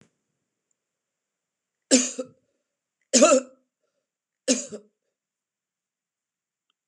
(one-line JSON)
{"three_cough_length": "6.9 s", "three_cough_amplitude": 25117, "three_cough_signal_mean_std_ratio": 0.23, "survey_phase": "beta (2021-08-13 to 2022-03-07)", "age": "65+", "gender": "Female", "wearing_mask": "No", "symptom_none": true, "smoker_status": "Never smoked", "respiratory_condition_asthma": false, "respiratory_condition_other": false, "recruitment_source": "REACT", "submission_delay": "1 day", "covid_test_result": "Negative", "covid_test_method": "RT-qPCR", "influenza_a_test_result": "Negative", "influenza_b_test_result": "Negative"}